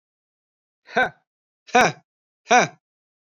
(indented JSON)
{
  "exhalation_length": "3.3 s",
  "exhalation_amplitude": 26497,
  "exhalation_signal_mean_std_ratio": 0.27,
  "survey_phase": "beta (2021-08-13 to 2022-03-07)",
  "age": "18-44",
  "gender": "Male",
  "wearing_mask": "No",
  "symptom_cough_any": true,
  "smoker_status": "Never smoked",
  "respiratory_condition_asthma": false,
  "respiratory_condition_other": false,
  "recruitment_source": "REACT",
  "submission_delay": "1 day",
  "covid_test_result": "Negative",
  "covid_test_method": "RT-qPCR"
}